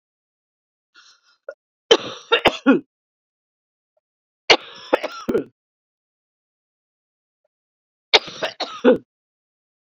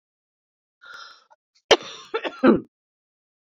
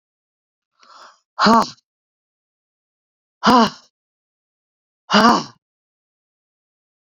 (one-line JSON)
{"three_cough_length": "9.9 s", "three_cough_amplitude": 30839, "three_cough_signal_mean_std_ratio": 0.24, "cough_length": "3.6 s", "cough_amplitude": 29808, "cough_signal_mean_std_ratio": 0.24, "exhalation_length": "7.2 s", "exhalation_amplitude": 32768, "exhalation_signal_mean_std_ratio": 0.27, "survey_phase": "beta (2021-08-13 to 2022-03-07)", "age": "45-64", "gender": "Female", "wearing_mask": "No", "symptom_cough_any": true, "symptom_runny_or_blocked_nose": true, "symptom_fatigue": true, "symptom_onset": "2 days", "smoker_status": "Never smoked", "respiratory_condition_asthma": true, "respiratory_condition_other": false, "recruitment_source": "Test and Trace", "submission_delay": "2 days", "covid_test_result": "Positive", "covid_test_method": "RT-qPCR", "covid_ct_value": 11.8, "covid_ct_gene": "ORF1ab gene", "covid_ct_mean": 12.2, "covid_viral_load": "100000000 copies/ml", "covid_viral_load_category": "High viral load (>1M copies/ml)"}